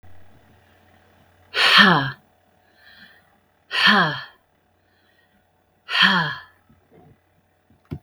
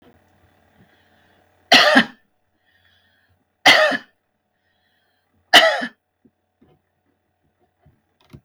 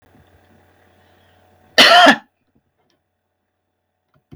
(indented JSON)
{
  "exhalation_length": "8.0 s",
  "exhalation_amplitude": 32768,
  "exhalation_signal_mean_std_ratio": 0.34,
  "three_cough_length": "8.4 s",
  "three_cough_amplitude": 32768,
  "three_cough_signal_mean_std_ratio": 0.26,
  "cough_length": "4.4 s",
  "cough_amplitude": 32768,
  "cough_signal_mean_std_ratio": 0.25,
  "survey_phase": "beta (2021-08-13 to 2022-03-07)",
  "age": "65+",
  "gender": "Female",
  "wearing_mask": "No",
  "symptom_none": true,
  "smoker_status": "Ex-smoker",
  "respiratory_condition_asthma": false,
  "respiratory_condition_other": false,
  "recruitment_source": "REACT",
  "submission_delay": "2 days",
  "covid_test_result": "Negative",
  "covid_test_method": "RT-qPCR",
  "influenza_a_test_result": "Negative",
  "influenza_b_test_result": "Negative"
}